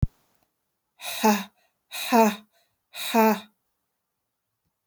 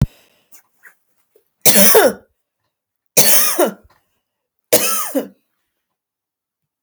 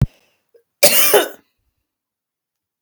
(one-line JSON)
{"exhalation_length": "4.9 s", "exhalation_amplitude": 15419, "exhalation_signal_mean_std_ratio": 0.35, "three_cough_length": "6.8 s", "three_cough_amplitude": 32768, "three_cough_signal_mean_std_ratio": 0.36, "cough_length": "2.8 s", "cough_amplitude": 32768, "cough_signal_mean_std_ratio": 0.32, "survey_phase": "beta (2021-08-13 to 2022-03-07)", "age": "45-64", "gender": "Female", "wearing_mask": "No", "symptom_none": true, "smoker_status": "Never smoked", "respiratory_condition_asthma": false, "respiratory_condition_other": false, "recruitment_source": "REACT", "submission_delay": "6 days", "covid_test_result": "Negative", "covid_test_method": "RT-qPCR"}